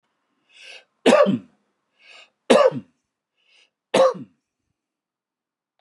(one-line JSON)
{"three_cough_length": "5.8 s", "three_cough_amplitude": 31952, "three_cough_signal_mean_std_ratio": 0.3, "survey_phase": "beta (2021-08-13 to 2022-03-07)", "age": "65+", "gender": "Male", "wearing_mask": "No", "symptom_none": true, "smoker_status": "Ex-smoker", "respiratory_condition_asthma": false, "respiratory_condition_other": false, "recruitment_source": "REACT", "submission_delay": "6 days", "covid_test_result": "Negative", "covid_test_method": "RT-qPCR"}